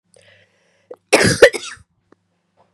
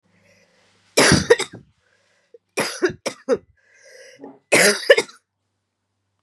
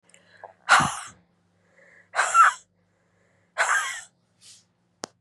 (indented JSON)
{
  "cough_length": "2.7 s",
  "cough_amplitude": 32768,
  "cough_signal_mean_std_ratio": 0.27,
  "three_cough_length": "6.2 s",
  "three_cough_amplitude": 32031,
  "three_cough_signal_mean_std_ratio": 0.33,
  "exhalation_length": "5.2 s",
  "exhalation_amplitude": 21169,
  "exhalation_signal_mean_std_ratio": 0.33,
  "survey_phase": "beta (2021-08-13 to 2022-03-07)",
  "age": "18-44",
  "gender": "Female",
  "wearing_mask": "No",
  "symptom_cough_any": true,
  "symptom_runny_or_blocked_nose": true,
  "symptom_shortness_of_breath": true,
  "symptom_sore_throat": true,
  "symptom_fatigue": true,
  "symptom_fever_high_temperature": true,
  "symptom_headache": true,
  "symptom_change_to_sense_of_smell_or_taste": true,
  "symptom_onset": "2 days",
  "smoker_status": "Ex-smoker",
  "respiratory_condition_asthma": false,
  "respiratory_condition_other": false,
  "recruitment_source": "Test and Trace",
  "submission_delay": "1 day",
  "covid_test_result": "Positive",
  "covid_test_method": "RT-qPCR",
  "covid_ct_value": 23.0,
  "covid_ct_gene": "ORF1ab gene",
  "covid_ct_mean": 27.7,
  "covid_viral_load": "810 copies/ml",
  "covid_viral_load_category": "Minimal viral load (< 10K copies/ml)"
}